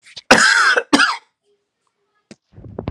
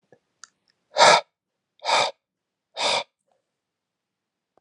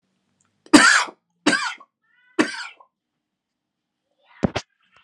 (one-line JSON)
{"cough_length": "2.9 s", "cough_amplitude": 32768, "cough_signal_mean_std_ratio": 0.42, "exhalation_length": "4.6 s", "exhalation_amplitude": 27841, "exhalation_signal_mean_std_ratio": 0.28, "three_cough_length": "5.0 s", "three_cough_amplitude": 32768, "three_cough_signal_mean_std_ratio": 0.28, "survey_phase": "alpha (2021-03-01 to 2021-08-12)", "age": "18-44", "gender": "Male", "wearing_mask": "No", "symptom_none": true, "smoker_status": "Never smoked", "respiratory_condition_asthma": false, "respiratory_condition_other": false, "recruitment_source": "REACT", "submission_delay": "1 day", "covid_test_result": "Negative", "covid_test_method": "RT-qPCR"}